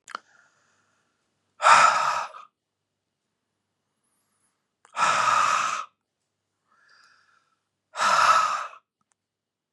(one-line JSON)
{"exhalation_length": "9.7 s", "exhalation_amplitude": 26123, "exhalation_signal_mean_std_ratio": 0.37, "survey_phase": "beta (2021-08-13 to 2022-03-07)", "age": "45-64", "gender": "Male", "wearing_mask": "No", "symptom_none": true, "smoker_status": "Ex-smoker", "respiratory_condition_asthma": false, "respiratory_condition_other": false, "recruitment_source": "REACT", "submission_delay": "2 days", "covid_test_result": "Negative", "covid_test_method": "RT-qPCR", "influenza_a_test_result": "Negative", "influenza_b_test_result": "Negative"}